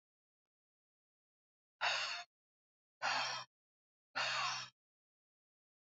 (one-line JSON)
{"exhalation_length": "5.9 s", "exhalation_amplitude": 2259, "exhalation_signal_mean_std_ratio": 0.38, "survey_phase": "beta (2021-08-13 to 2022-03-07)", "age": "18-44", "gender": "Female", "wearing_mask": "No", "symptom_cough_any": true, "symptom_runny_or_blocked_nose": true, "symptom_fatigue": true, "symptom_headache": true, "symptom_change_to_sense_of_smell_or_taste": true, "symptom_loss_of_taste": true, "symptom_onset": "3 days", "smoker_status": "Ex-smoker", "respiratory_condition_asthma": false, "respiratory_condition_other": false, "recruitment_source": "Test and Trace", "submission_delay": "2 days", "covid_test_result": "Positive", "covid_test_method": "RT-qPCR", "covid_ct_value": 33.8, "covid_ct_gene": "ORF1ab gene"}